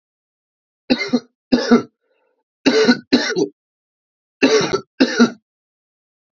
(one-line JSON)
{"three_cough_length": "6.3 s", "three_cough_amplitude": 31678, "three_cough_signal_mean_std_ratio": 0.41, "survey_phase": "alpha (2021-03-01 to 2021-08-12)", "age": "18-44", "gender": "Male", "wearing_mask": "No", "symptom_cough_any": true, "symptom_headache": true, "smoker_status": "Never smoked", "respiratory_condition_asthma": false, "respiratory_condition_other": false, "recruitment_source": "Test and Trace", "submission_delay": "1 day", "covid_test_result": "Positive", "covid_test_method": "RT-qPCR", "covid_ct_value": 13.3, "covid_ct_gene": "ORF1ab gene", "covid_ct_mean": 14.1, "covid_viral_load": "25000000 copies/ml", "covid_viral_load_category": "High viral load (>1M copies/ml)"}